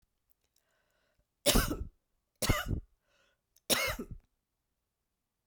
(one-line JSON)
{"three_cough_length": "5.5 s", "three_cough_amplitude": 9204, "three_cough_signal_mean_std_ratio": 0.32, "survey_phase": "beta (2021-08-13 to 2022-03-07)", "age": "65+", "gender": "Female", "wearing_mask": "No", "symptom_runny_or_blocked_nose": true, "symptom_fatigue": true, "symptom_headache": true, "symptom_change_to_sense_of_smell_or_taste": true, "symptom_loss_of_taste": true, "symptom_onset": "4 days", "smoker_status": "Never smoked", "respiratory_condition_asthma": false, "respiratory_condition_other": false, "recruitment_source": "Test and Trace", "submission_delay": "2 days", "covid_test_result": "Positive", "covid_test_method": "ePCR"}